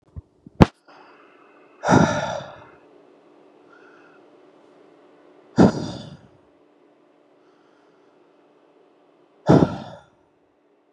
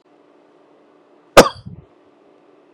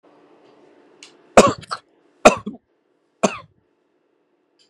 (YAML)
exhalation_length: 10.9 s
exhalation_amplitude: 32768
exhalation_signal_mean_std_ratio: 0.24
cough_length: 2.7 s
cough_amplitude: 32768
cough_signal_mean_std_ratio: 0.17
three_cough_length: 4.7 s
three_cough_amplitude: 32768
three_cough_signal_mean_std_ratio: 0.2
survey_phase: beta (2021-08-13 to 2022-03-07)
age: 18-44
gender: Male
wearing_mask: 'No'
symptom_none: true
smoker_status: Never smoked
respiratory_condition_asthma: false
respiratory_condition_other: false
recruitment_source: REACT
submission_delay: 1 day
covid_test_result: Negative
covid_test_method: RT-qPCR
influenza_a_test_result: Unknown/Void
influenza_b_test_result: Unknown/Void